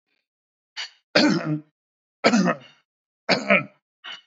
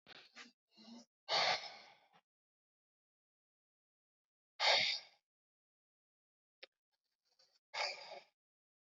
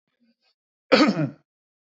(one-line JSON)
{"three_cough_length": "4.3 s", "three_cough_amplitude": 26315, "three_cough_signal_mean_std_ratio": 0.4, "exhalation_length": "9.0 s", "exhalation_amplitude": 3697, "exhalation_signal_mean_std_ratio": 0.27, "cough_length": "2.0 s", "cough_amplitude": 24300, "cough_signal_mean_std_ratio": 0.32, "survey_phase": "beta (2021-08-13 to 2022-03-07)", "age": "45-64", "gender": "Male", "wearing_mask": "No", "symptom_none": true, "smoker_status": "Ex-smoker", "respiratory_condition_asthma": false, "respiratory_condition_other": false, "recruitment_source": "REACT", "submission_delay": "1 day", "covid_test_result": "Negative", "covid_test_method": "RT-qPCR", "influenza_a_test_result": "Negative", "influenza_b_test_result": "Negative"}